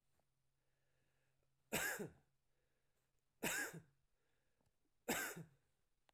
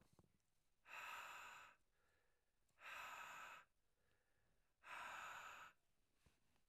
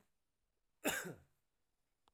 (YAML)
three_cough_length: 6.1 s
three_cough_amplitude: 1399
three_cough_signal_mean_std_ratio: 0.34
exhalation_length: 6.7 s
exhalation_amplitude: 235
exhalation_signal_mean_std_ratio: 0.6
cough_length: 2.1 s
cough_amplitude: 2257
cough_signal_mean_std_ratio: 0.28
survey_phase: beta (2021-08-13 to 2022-03-07)
age: 45-64
gender: Male
wearing_mask: 'No'
symptom_cough_any: true
symptom_runny_or_blocked_nose: true
symptom_abdominal_pain: true
symptom_fatigue: true
symptom_headache: true
symptom_onset: 6 days
smoker_status: Ex-smoker
respiratory_condition_asthma: false
respiratory_condition_other: false
recruitment_source: Test and Trace
submission_delay: 1 day
covid_test_result: Positive
covid_test_method: RT-qPCR
covid_ct_value: 14.5
covid_ct_gene: ORF1ab gene
covid_ct_mean: 15.0
covid_viral_load: 12000000 copies/ml
covid_viral_load_category: High viral load (>1M copies/ml)